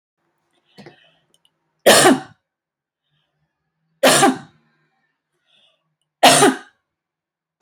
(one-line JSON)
{"three_cough_length": "7.6 s", "three_cough_amplitude": 32768, "three_cough_signal_mean_std_ratio": 0.29, "survey_phase": "beta (2021-08-13 to 2022-03-07)", "age": "45-64", "gender": "Female", "wearing_mask": "No", "symptom_none": true, "smoker_status": "Ex-smoker", "respiratory_condition_asthma": false, "respiratory_condition_other": false, "recruitment_source": "REACT", "submission_delay": "0 days", "covid_test_result": "Negative", "covid_test_method": "RT-qPCR", "influenza_a_test_result": "Negative", "influenza_b_test_result": "Negative"}